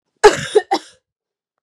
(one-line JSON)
{"cough_length": "1.6 s", "cough_amplitude": 32768, "cough_signal_mean_std_ratio": 0.31, "survey_phase": "beta (2021-08-13 to 2022-03-07)", "age": "18-44", "gender": "Female", "wearing_mask": "No", "symptom_cough_any": true, "symptom_runny_or_blocked_nose": true, "symptom_shortness_of_breath": true, "symptom_fatigue": true, "symptom_fever_high_temperature": true, "symptom_headache": true, "symptom_change_to_sense_of_smell_or_taste": true, "symptom_loss_of_taste": true, "symptom_other": true, "symptom_onset": "4 days", "smoker_status": "Never smoked", "respiratory_condition_asthma": true, "respiratory_condition_other": true, "recruitment_source": "Test and Trace", "submission_delay": "2 days", "covid_test_result": "Positive", "covid_test_method": "LAMP"}